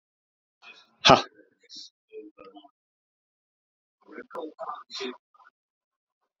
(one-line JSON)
{"exhalation_length": "6.4 s", "exhalation_amplitude": 27865, "exhalation_signal_mean_std_ratio": 0.18, "survey_phase": "alpha (2021-03-01 to 2021-08-12)", "age": "18-44", "gender": "Male", "wearing_mask": "No", "symptom_fatigue": true, "symptom_change_to_sense_of_smell_or_taste": true, "symptom_loss_of_taste": true, "symptom_onset": "6 days", "smoker_status": "Ex-smoker", "respiratory_condition_asthma": false, "respiratory_condition_other": false, "recruitment_source": "Test and Trace", "submission_delay": "3 days", "covid_test_result": "Positive", "covid_test_method": "RT-qPCR", "covid_ct_value": 17.7, "covid_ct_gene": "ORF1ab gene", "covid_ct_mean": 19.0, "covid_viral_load": "600000 copies/ml", "covid_viral_load_category": "Low viral load (10K-1M copies/ml)"}